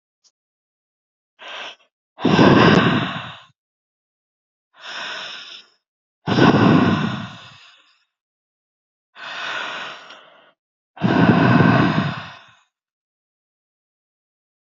{
  "exhalation_length": "14.7 s",
  "exhalation_amplitude": 27913,
  "exhalation_signal_mean_std_ratio": 0.4,
  "survey_phase": "beta (2021-08-13 to 2022-03-07)",
  "age": "45-64",
  "gender": "Female",
  "wearing_mask": "No",
  "symptom_cough_any": true,
  "symptom_runny_or_blocked_nose": true,
  "symptom_shortness_of_breath": true,
  "symptom_sore_throat": true,
  "symptom_fatigue": true,
  "symptom_fever_high_temperature": true,
  "symptom_headache": true,
  "symptom_change_to_sense_of_smell_or_taste": true,
  "symptom_onset": "3 days",
  "smoker_status": "Never smoked",
  "respiratory_condition_asthma": false,
  "respiratory_condition_other": false,
  "recruitment_source": "Test and Trace",
  "submission_delay": "1 day",
  "covid_test_result": "Positive",
  "covid_test_method": "RT-qPCR",
  "covid_ct_value": 15.1,
  "covid_ct_gene": "ORF1ab gene",
  "covid_ct_mean": 15.3,
  "covid_viral_load": "9800000 copies/ml",
  "covid_viral_load_category": "High viral load (>1M copies/ml)"
}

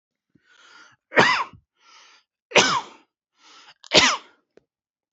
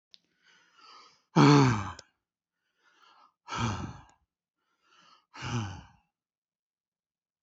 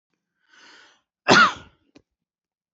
{
  "three_cough_length": "5.1 s",
  "three_cough_amplitude": 32767,
  "three_cough_signal_mean_std_ratio": 0.3,
  "exhalation_length": "7.4 s",
  "exhalation_amplitude": 13664,
  "exhalation_signal_mean_std_ratio": 0.27,
  "cough_length": "2.7 s",
  "cough_amplitude": 27780,
  "cough_signal_mean_std_ratio": 0.25,
  "survey_phase": "beta (2021-08-13 to 2022-03-07)",
  "age": "18-44",
  "gender": "Male",
  "wearing_mask": "No",
  "symptom_none": true,
  "smoker_status": "Never smoked",
  "respiratory_condition_asthma": true,
  "respiratory_condition_other": false,
  "recruitment_source": "REACT",
  "submission_delay": "1 day",
  "covid_test_result": "Negative",
  "covid_test_method": "RT-qPCR",
  "influenza_a_test_result": "Negative",
  "influenza_b_test_result": "Negative"
}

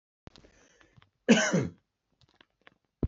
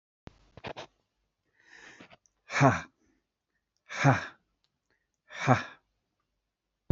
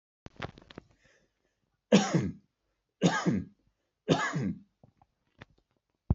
{
  "cough_length": "3.1 s",
  "cough_amplitude": 13820,
  "cough_signal_mean_std_ratio": 0.28,
  "exhalation_length": "6.9 s",
  "exhalation_amplitude": 17252,
  "exhalation_signal_mean_std_ratio": 0.26,
  "three_cough_length": "6.1 s",
  "three_cough_amplitude": 14126,
  "three_cough_signal_mean_std_ratio": 0.34,
  "survey_phase": "beta (2021-08-13 to 2022-03-07)",
  "age": "45-64",
  "gender": "Male",
  "wearing_mask": "No",
  "symptom_none": true,
  "smoker_status": "Never smoked",
  "respiratory_condition_asthma": false,
  "respiratory_condition_other": false,
  "recruitment_source": "REACT",
  "submission_delay": "3 days",
  "covid_test_result": "Negative",
  "covid_test_method": "RT-qPCR",
  "influenza_a_test_result": "Negative",
  "influenza_b_test_result": "Negative"
}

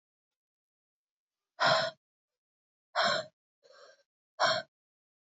{
  "exhalation_length": "5.4 s",
  "exhalation_amplitude": 6272,
  "exhalation_signal_mean_std_ratio": 0.31,
  "survey_phase": "alpha (2021-03-01 to 2021-08-12)",
  "age": "18-44",
  "gender": "Female",
  "wearing_mask": "No",
  "symptom_cough_any": true,
  "symptom_fatigue": true,
  "symptom_headache": true,
  "symptom_change_to_sense_of_smell_or_taste": true,
  "symptom_onset": "3 days",
  "smoker_status": "Current smoker (e-cigarettes or vapes only)",
  "respiratory_condition_asthma": false,
  "respiratory_condition_other": false,
  "recruitment_source": "Test and Trace",
  "submission_delay": "2 days",
  "covid_test_result": "Positive",
  "covid_test_method": "RT-qPCR",
  "covid_ct_value": 16.4,
  "covid_ct_gene": "N gene",
  "covid_ct_mean": 16.6,
  "covid_viral_load": "3500000 copies/ml",
  "covid_viral_load_category": "High viral load (>1M copies/ml)"
}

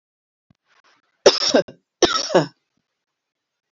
{
  "cough_length": "3.7 s",
  "cough_amplitude": 28816,
  "cough_signal_mean_std_ratio": 0.29,
  "survey_phase": "alpha (2021-03-01 to 2021-08-12)",
  "age": "45-64",
  "gender": "Female",
  "wearing_mask": "No",
  "symptom_none": true,
  "smoker_status": "Never smoked",
  "respiratory_condition_asthma": false,
  "respiratory_condition_other": false,
  "recruitment_source": "REACT",
  "submission_delay": "2 days",
  "covid_test_result": "Negative",
  "covid_test_method": "RT-qPCR"
}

